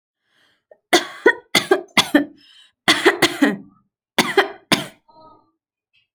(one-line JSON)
{"three_cough_length": "6.1 s", "three_cough_amplitude": 32767, "three_cough_signal_mean_std_ratio": 0.36, "survey_phase": "alpha (2021-03-01 to 2021-08-12)", "age": "18-44", "gender": "Female", "wearing_mask": "No", "symptom_none": true, "smoker_status": "Never smoked", "respiratory_condition_asthma": true, "respiratory_condition_other": false, "recruitment_source": "REACT", "submission_delay": "2 days", "covid_test_result": "Negative", "covid_test_method": "RT-qPCR"}